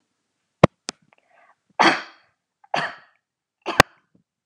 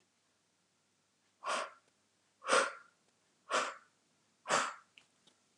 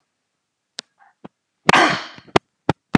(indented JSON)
{
  "three_cough_length": "4.5 s",
  "three_cough_amplitude": 32768,
  "three_cough_signal_mean_std_ratio": 0.19,
  "exhalation_length": "5.6 s",
  "exhalation_amplitude": 5544,
  "exhalation_signal_mean_std_ratio": 0.32,
  "cough_length": "3.0 s",
  "cough_amplitude": 32768,
  "cough_signal_mean_std_ratio": 0.25,
  "survey_phase": "beta (2021-08-13 to 2022-03-07)",
  "age": "45-64",
  "gender": "Female",
  "wearing_mask": "No",
  "symptom_none": true,
  "symptom_onset": "12 days",
  "smoker_status": "Never smoked",
  "respiratory_condition_asthma": false,
  "respiratory_condition_other": false,
  "recruitment_source": "REACT",
  "submission_delay": "1 day",
  "covid_test_result": "Negative",
  "covid_test_method": "RT-qPCR"
}